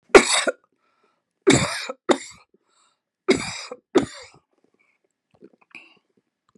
{"cough_length": "6.6 s", "cough_amplitude": 32768, "cough_signal_mean_std_ratio": 0.27, "survey_phase": "beta (2021-08-13 to 2022-03-07)", "age": "65+", "gender": "Female", "wearing_mask": "No", "symptom_none": true, "smoker_status": "Never smoked", "respiratory_condition_asthma": false, "respiratory_condition_other": false, "recruitment_source": "REACT", "submission_delay": "2 days", "covid_test_result": "Negative", "covid_test_method": "RT-qPCR", "influenza_a_test_result": "Negative", "influenza_b_test_result": "Negative"}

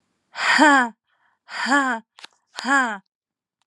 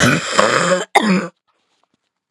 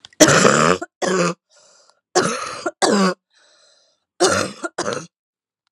{"exhalation_length": "3.7 s", "exhalation_amplitude": 28542, "exhalation_signal_mean_std_ratio": 0.44, "cough_length": "2.3 s", "cough_amplitude": 32768, "cough_signal_mean_std_ratio": 0.58, "three_cough_length": "5.7 s", "three_cough_amplitude": 32768, "three_cough_signal_mean_std_ratio": 0.47, "survey_phase": "beta (2021-08-13 to 2022-03-07)", "age": "18-44", "gender": "Female", "wearing_mask": "No", "symptom_new_continuous_cough": true, "symptom_runny_or_blocked_nose": true, "symptom_shortness_of_breath": true, "symptom_abdominal_pain": true, "symptom_fever_high_temperature": true, "symptom_headache": true, "symptom_onset": "3 days", "smoker_status": "Ex-smoker", "respiratory_condition_asthma": false, "respiratory_condition_other": false, "recruitment_source": "Test and Trace", "submission_delay": "1 day", "covid_test_result": "Positive", "covid_test_method": "RT-qPCR", "covid_ct_value": 23.8, "covid_ct_gene": "ORF1ab gene"}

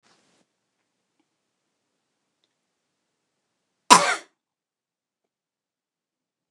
{"cough_length": "6.5 s", "cough_amplitude": 29204, "cough_signal_mean_std_ratio": 0.13, "survey_phase": "beta (2021-08-13 to 2022-03-07)", "age": "45-64", "gender": "Female", "wearing_mask": "No", "symptom_none": true, "smoker_status": "Never smoked", "respiratory_condition_asthma": false, "respiratory_condition_other": false, "recruitment_source": "REACT", "submission_delay": "3 days", "covid_test_result": "Negative", "covid_test_method": "RT-qPCR", "influenza_a_test_result": "Negative", "influenza_b_test_result": "Negative"}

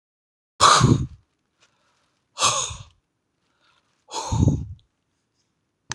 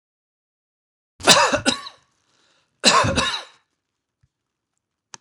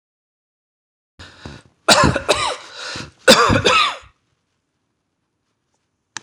{"exhalation_length": "5.9 s", "exhalation_amplitude": 25052, "exhalation_signal_mean_std_ratio": 0.33, "three_cough_length": "5.2 s", "three_cough_amplitude": 26028, "three_cough_signal_mean_std_ratio": 0.33, "cough_length": "6.2 s", "cough_amplitude": 26028, "cough_signal_mean_std_ratio": 0.36, "survey_phase": "beta (2021-08-13 to 2022-03-07)", "age": "45-64", "gender": "Male", "wearing_mask": "No", "symptom_none": true, "smoker_status": "Never smoked", "respiratory_condition_asthma": false, "respiratory_condition_other": false, "recruitment_source": "REACT", "submission_delay": "2 days", "covid_test_result": "Negative", "covid_test_method": "RT-qPCR"}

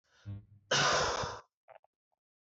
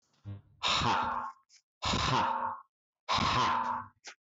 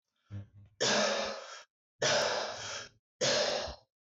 {"cough_length": "2.6 s", "cough_amplitude": 3618, "cough_signal_mean_std_ratio": 0.46, "exhalation_length": "4.3 s", "exhalation_amplitude": 4485, "exhalation_signal_mean_std_ratio": 0.7, "three_cough_length": "4.0 s", "three_cough_amplitude": 3652, "three_cough_signal_mean_std_ratio": 0.63, "survey_phase": "beta (2021-08-13 to 2022-03-07)", "age": "45-64", "gender": "Male", "wearing_mask": "No", "symptom_none": true, "smoker_status": "Never smoked", "respiratory_condition_asthma": false, "respiratory_condition_other": false, "recruitment_source": "REACT", "submission_delay": "1 day", "covid_test_result": "Negative", "covid_test_method": "RT-qPCR"}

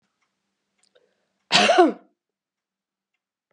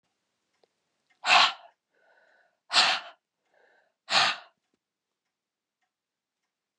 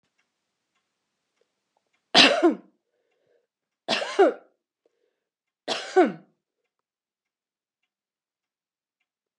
{"cough_length": "3.5 s", "cough_amplitude": 27023, "cough_signal_mean_std_ratio": 0.26, "exhalation_length": "6.8 s", "exhalation_amplitude": 16160, "exhalation_signal_mean_std_ratio": 0.26, "three_cough_length": "9.4 s", "three_cough_amplitude": 28390, "three_cough_signal_mean_std_ratio": 0.24, "survey_phase": "beta (2021-08-13 to 2022-03-07)", "age": "65+", "gender": "Female", "wearing_mask": "No", "symptom_none": true, "smoker_status": "Never smoked", "respiratory_condition_asthma": false, "respiratory_condition_other": false, "recruitment_source": "REACT", "submission_delay": "3 days", "covid_test_result": "Negative", "covid_test_method": "RT-qPCR", "influenza_a_test_result": "Negative", "influenza_b_test_result": "Negative"}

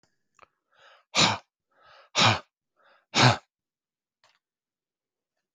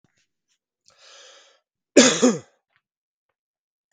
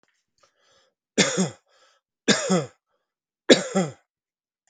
{"exhalation_length": "5.5 s", "exhalation_amplitude": 20016, "exhalation_signal_mean_std_ratio": 0.27, "cough_length": "3.9 s", "cough_amplitude": 32768, "cough_signal_mean_std_ratio": 0.23, "three_cough_length": "4.7 s", "three_cough_amplitude": 32768, "three_cough_signal_mean_std_ratio": 0.31, "survey_phase": "beta (2021-08-13 to 2022-03-07)", "age": "45-64", "gender": "Male", "wearing_mask": "No", "symptom_none": true, "smoker_status": "Never smoked", "respiratory_condition_asthma": false, "respiratory_condition_other": false, "recruitment_source": "REACT", "submission_delay": "2 days", "covid_test_result": "Negative", "covid_test_method": "RT-qPCR"}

